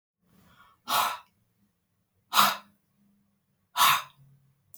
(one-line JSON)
{"exhalation_length": "4.8 s", "exhalation_amplitude": 19542, "exhalation_signal_mean_std_ratio": 0.31, "survey_phase": "alpha (2021-03-01 to 2021-08-12)", "age": "18-44", "gender": "Male", "wearing_mask": "No", "symptom_none": true, "smoker_status": "Never smoked", "respiratory_condition_asthma": false, "respiratory_condition_other": false, "recruitment_source": "REACT", "submission_delay": "1 day", "covid_test_result": "Negative", "covid_test_method": "RT-qPCR"}